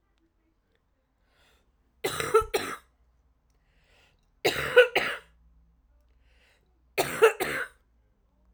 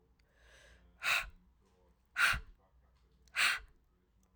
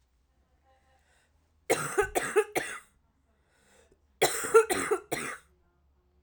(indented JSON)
{
  "three_cough_length": "8.5 s",
  "three_cough_amplitude": 21051,
  "three_cough_signal_mean_std_ratio": 0.29,
  "exhalation_length": "4.4 s",
  "exhalation_amplitude": 4466,
  "exhalation_signal_mean_std_ratio": 0.34,
  "cough_length": "6.2 s",
  "cough_amplitude": 12706,
  "cough_signal_mean_std_ratio": 0.35,
  "survey_phase": "alpha (2021-03-01 to 2021-08-12)",
  "age": "18-44",
  "gender": "Female",
  "wearing_mask": "No",
  "symptom_cough_any": true,
  "symptom_new_continuous_cough": true,
  "symptom_diarrhoea": true,
  "symptom_fatigue": true,
  "symptom_fever_high_temperature": true,
  "symptom_headache": true,
  "symptom_change_to_sense_of_smell_or_taste": true,
  "symptom_loss_of_taste": true,
  "symptom_onset": "4 days",
  "smoker_status": "Ex-smoker",
  "respiratory_condition_asthma": false,
  "respiratory_condition_other": false,
  "recruitment_source": "Test and Trace",
  "submission_delay": "2 days",
  "covid_test_result": "Positive",
  "covid_test_method": "RT-qPCR"
}